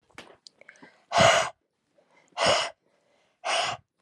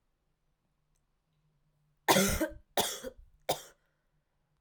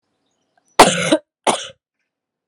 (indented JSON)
{
  "exhalation_length": "4.0 s",
  "exhalation_amplitude": 15829,
  "exhalation_signal_mean_std_ratio": 0.39,
  "three_cough_length": "4.6 s",
  "three_cough_amplitude": 12833,
  "three_cough_signal_mean_std_ratio": 0.3,
  "cough_length": "2.5 s",
  "cough_amplitude": 32768,
  "cough_signal_mean_std_ratio": 0.3,
  "survey_phase": "alpha (2021-03-01 to 2021-08-12)",
  "age": "18-44",
  "gender": "Female",
  "wearing_mask": "No",
  "symptom_cough_any": true,
  "symptom_new_continuous_cough": true,
  "symptom_shortness_of_breath": true,
  "symptom_fever_high_temperature": true,
  "symptom_headache": true,
  "symptom_change_to_sense_of_smell_or_taste": true,
  "symptom_onset": "2 days",
  "smoker_status": "Current smoker (e-cigarettes or vapes only)",
  "respiratory_condition_asthma": false,
  "respiratory_condition_other": false,
  "recruitment_source": "Test and Trace",
  "submission_delay": "1 day",
  "covid_test_result": "Positive",
  "covid_test_method": "RT-qPCR",
  "covid_ct_value": 15.0,
  "covid_ct_gene": "ORF1ab gene",
  "covid_ct_mean": 15.3,
  "covid_viral_load": "9800000 copies/ml",
  "covid_viral_load_category": "High viral load (>1M copies/ml)"
}